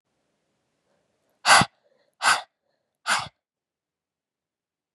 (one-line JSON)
{"exhalation_length": "4.9 s", "exhalation_amplitude": 26436, "exhalation_signal_mean_std_ratio": 0.23, "survey_phase": "beta (2021-08-13 to 2022-03-07)", "age": "18-44", "gender": "Female", "wearing_mask": "No", "symptom_cough_any": true, "symptom_runny_or_blocked_nose": true, "symptom_headache": true, "symptom_onset": "3 days", "smoker_status": "Never smoked", "respiratory_condition_asthma": false, "respiratory_condition_other": false, "recruitment_source": "REACT", "submission_delay": "1 day", "covid_test_result": "Positive", "covid_test_method": "RT-qPCR", "covid_ct_value": 27.0, "covid_ct_gene": "E gene", "influenza_a_test_result": "Negative", "influenza_b_test_result": "Negative"}